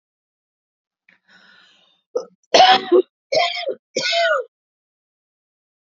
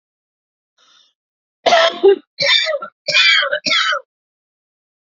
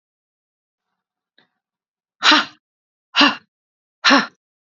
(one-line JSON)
{"cough_length": "5.8 s", "cough_amplitude": 29292, "cough_signal_mean_std_ratio": 0.35, "three_cough_length": "5.1 s", "three_cough_amplitude": 31208, "three_cough_signal_mean_std_ratio": 0.47, "exhalation_length": "4.8 s", "exhalation_amplitude": 31533, "exhalation_signal_mean_std_ratio": 0.27, "survey_phase": "alpha (2021-03-01 to 2021-08-12)", "age": "45-64", "gender": "Female", "wearing_mask": "No", "symptom_none": true, "smoker_status": "Never smoked", "respiratory_condition_asthma": true, "respiratory_condition_other": false, "recruitment_source": "REACT", "submission_delay": "3 days", "covid_test_result": "Negative", "covid_test_method": "RT-qPCR"}